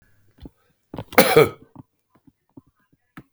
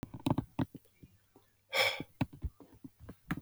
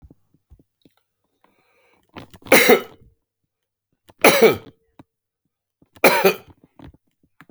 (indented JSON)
{
  "cough_length": "3.3 s",
  "cough_amplitude": 32768,
  "cough_signal_mean_std_ratio": 0.24,
  "exhalation_length": "3.4 s",
  "exhalation_amplitude": 4943,
  "exhalation_signal_mean_std_ratio": 0.38,
  "three_cough_length": "7.5 s",
  "three_cough_amplitude": 32768,
  "three_cough_signal_mean_std_ratio": 0.27,
  "survey_phase": "beta (2021-08-13 to 2022-03-07)",
  "age": "65+",
  "gender": "Male",
  "wearing_mask": "No",
  "symptom_none": true,
  "smoker_status": "Never smoked",
  "respiratory_condition_asthma": false,
  "respiratory_condition_other": false,
  "recruitment_source": "REACT",
  "submission_delay": "0 days",
  "covid_test_result": "Negative",
  "covid_test_method": "RT-qPCR"
}